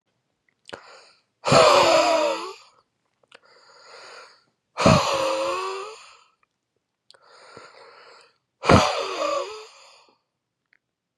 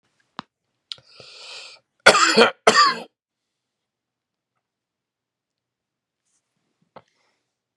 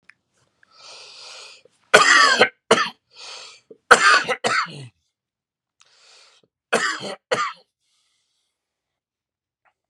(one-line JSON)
{"exhalation_length": "11.2 s", "exhalation_amplitude": 29120, "exhalation_signal_mean_std_ratio": 0.39, "cough_length": "7.8 s", "cough_amplitude": 32768, "cough_signal_mean_std_ratio": 0.23, "three_cough_length": "9.9 s", "three_cough_amplitude": 32768, "three_cough_signal_mean_std_ratio": 0.32, "survey_phase": "beta (2021-08-13 to 2022-03-07)", "age": "18-44", "gender": "Male", "wearing_mask": "No", "symptom_cough_any": true, "symptom_runny_or_blocked_nose": true, "symptom_change_to_sense_of_smell_or_taste": true, "symptom_loss_of_taste": true, "smoker_status": "Current smoker (1 to 10 cigarettes per day)", "respiratory_condition_asthma": false, "respiratory_condition_other": false, "recruitment_source": "Test and Trace", "submission_delay": "1 day", "covid_test_result": "Positive", "covid_test_method": "RT-qPCR", "covid_ct_value": 18.5, "covid_ct_gene": "ORF1ab gene", "covid_ct_mean": 18.8, "covid_viral_load": "660000 copies/ml", "covid_viral_load_category": "Low viral load (10K-1M copies/ml)"}